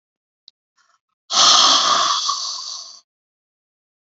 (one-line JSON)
{"exhalation_length": "4.0 s", "exhalation_amplitude": 32767, "exhalation_signal_mean_std_ratio": 0.46, "survey_phase": "beta (2021-08-13 to 2022-03-07)", "age": "45-64", "gender": "Female", "wearing_mask": "No", "symptom_cough_any": true, "symptom_new_continuous_cough": true, "symptom_fatigue": true, "symptom_headache": true, "symptom_change_to_sense_of_smell_or_taste": true, "smoker_status": "Ex-smoker", "respiratory_condition_asthma": false, "respiratory_condition_other": false, "recruitment_source": "Test and Trace", "submission_delay": "-1 day", "covid_test_result": "Positive", "covid_test_method": "LFT"}